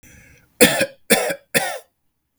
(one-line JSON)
{"three_cough_length": "2.4 s", "three_cough_amplitude": 32768, "three_cough_signal_mean_std_ratio": 0.39, "survey_phase": "beta (2021-08-13 to 2022-03-07)", "age": "18-44", "gender": "Male", "wearing_mask": "No", "symptom_none": true, "smoker_status": "Never smoked", "respiratory_condition_asthma": false, "respiratory_condition_other": false, "recruitment_source": "REACT", "submission_delay": "1 day", "covid_test_result": "Negative", "covid_test_method": "RT-qPCR", "influenza_a_test_result": "Negative", "influenza_b_test_result": "Negative"}